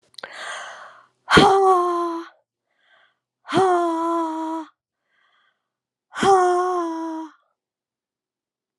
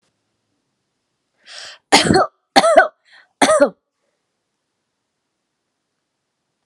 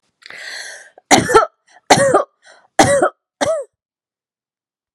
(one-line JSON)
{"exhalation_length": "8.8 s", "exhalation_amplitude": 30820, "exhalation_signal_mean_std_ratio": 0.48, "three_cough_length": "6.7 s", "three_cough_amplitude": 32768, "three_cough_signal_mean_std_ratio": 0.29, "cough_length": "4.9 s", "cough_amplitude": 32768, "cough_signal_mean_std_ratio": 0.4, "survey_phase": "alpha (2021-03-01 to 2021-08-12)", "age": "45-64", "gender": "Female", "wearing_mask": "No", "symptom_none": true, "smoker_status": "Never smoked", "respiratory_condition_asthma": false, "respiratory_condition_other": false, "recruitment_source": "REACT", "submission_delay": "2 days", "covid_test_result": "Negative", "covid_test_method": "RT-qPCR"}